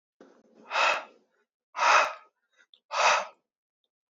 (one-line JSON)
{"exhalation_length": "4.1 s", "exhalation_amplitude": 13909, "exhalation_signal_mean_std_ratio": 0.39, "survey_phase": "beta (2021-08-13 to 2022-03-07)", "age": "18-44", "gender": "Male", "wearing_mask": "No", "symptom_cough_any": true, "symptom_sore_throat": true, "symptom_fatigue": true, "symptom_headache": true, "symptom_onset": "9 days", "smoker_status": "Ex-smoker", "respiratory_condition_asthma": false, "respiratory_condition_other": false, "recruitment_source": "REACT", "submission_delay": "1 day", "covid_test_result": "Positive", "covid_test_method": "RT-qPCR", "covid_ct_value": 34.0, "covid_ct_gene": "E gene", "influenza_a_test_result": "Negative", "influenza_b_test_result": "Negative"}